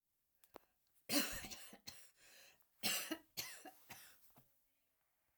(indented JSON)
{
  "cough_length": "5.4 s",
  "cough_amplitude": 2745,
  "cough_signal_mean_std_ratio": 0.36,
  "survey_phase": "alpha (2021-03-01 to 2021-08-12)",
  "age": "65+",
  "gender": "Female",
  "wearing_mask": "No",
  "symptom_cough_any": true,
  "smoker_status": "Ex-smoker",
  "respiratory_condition_asthma": false,
  "respiratory_condition_other": false,
  "recruitment_source": "REACT",
  "submission_delay": "1 day",
  "covid_test_result": "Negative",
  "covid_test_method": "RT-qPCR"
}